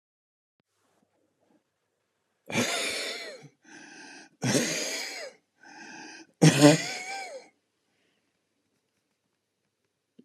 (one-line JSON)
{"exhalation_length": "10.2 s", "exhalation_amplitude": 19649, "exhalation_signal_mean_std_ratio": 0.3, "survey_phase": "alpha (2021-03-01 to 2021-08-12)", "age": "65+", "gender": "Male", "wearing_mask": "No", "symptom_none": true, "smoker_status": "Ex-smoker", "respiratory_condition_asthma": false, "respiratory_condition_other": true, "recruitment_source": "REACT", "submission_delay": "2 days", "covid_test_result": "Negative", "covid_test_method": "RT-qPCR"}